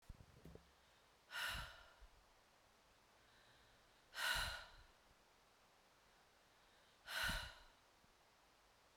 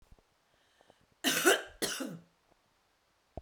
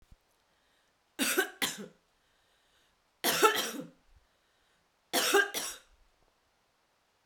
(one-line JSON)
{"exhalation_length": "9.0 s", "exhalation_amplitude": 1162, "exhalation_signal_mean_std_ratio": 0.4, "cough_length": "3.4 s", "cough_amplitude": 9426, "cough_signal_mean_std_ratio": 0.32, "three_cough_length": "7.3 s", "three_cough_amplitude": 9997, "three_cough_signal_mean_std_ratio": 0.34, "survey_phase": "beta (2021-08-13 to 2022-03-07)", "age": "45-64", "gender": "Female", "wearing_mask": "No", "symptom_cough_any": true, "symptom_new_continuous_cough": true, "symptom_runny_or_blocked_nose": true, "symptom_fatigue": true, "symptom_headache": true, "symptom_change_to_sense_of_smell_or_taste": true, "symptom_loss_of_taste": true, "symptom_onset": "8 days", "smoker_status": "Never smoked", "respiratory_condition_asthma": false, "respiratory_condition_other": false, "recruitment_source": "Test and Trace", "submission_delay": "4 days", "covid_test_result": "Positive", "covid_test_method": "RT-qPCR", "covid_ct_value": 17.0, "covid_ct_gene": "N gene"}